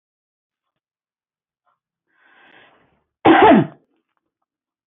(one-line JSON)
{"cough_length": "4.9 s", "cough_amplitude": 26876, "cough_signal_mean_std_ratio": 0.25, "survey_phase": "beta (2021-08-13 to 2022-03-07)", "age": "65+", "gender": "Female", "wearing_mask": "No", "symptom_none": true, "smoker_status": "Ex-smoker", "respiratory_condition_asthma": false, "respiratory_condition_other": false, "recruitment_source": "REACT", "submission_delay": "1 day", "covid_test_result": "Negative", "covid_test_method": "RT-qPCR", "influenza_a_test_result": "Negative", "influenza_b_test_result": "Negative"}